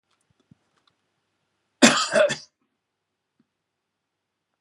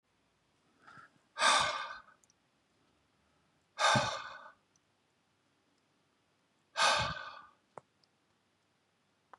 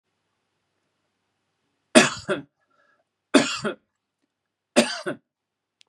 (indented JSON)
{
  "cough_length": "4.6 s",
  "cough_amplitude": 32767,
  "cough_signal_mean_std_ratio": 0.23,
  "exhalation_length": "9.4 s",
  "exhalation_amplitude": 7103,
  "exhalation_signal_mean_std_ratio": 0.31,
  "three_cough_length": "5.9 s",
  "three_cough_amplitude": 32767,
  "three_cough_signal_mean_std_ratio": 0.24,
  "survey_phase": "beta (2021-08-13 to 2022-03-07)",
  "age": "45-64",
  "gender": "Male",
  "wearing_mask": "No",
  "symptom_none": true,
  "smoker_status": "Never smoked",
  "respiratory_condition_asthma": false,
  "respiratory_condition_other": false,
  "recruitment_source": "REACT",
  "submission_delay": "1 day",
  "covid_test_result": "Negative",
  "covid_test_method": "RT-qPCR",
  "influenza_a_test_result": "Negative",
  "influenza_b_test_result": "Negative"
}